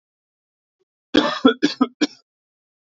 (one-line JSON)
{"three_cough_length": "2.8 s", "three_cough_amplitude": 32768, "three_cough_signal_mean_std_ratio": 0.31, "survey_phase": "beta (2021-08-13 to 2022-03-07)", "age": "18-44", "gender": "Male", "wearing_mask": "No", "symptom_cough_any": true, "smoker_status": "Never smoked", "respiratory_condition_asthma": false, "respiratory_condition_other": false, "recruitment_source": "Test and Trace", "submission_delay": "1 day", "covid_test_result": "Positive", "covid_test_method": "ePCR"}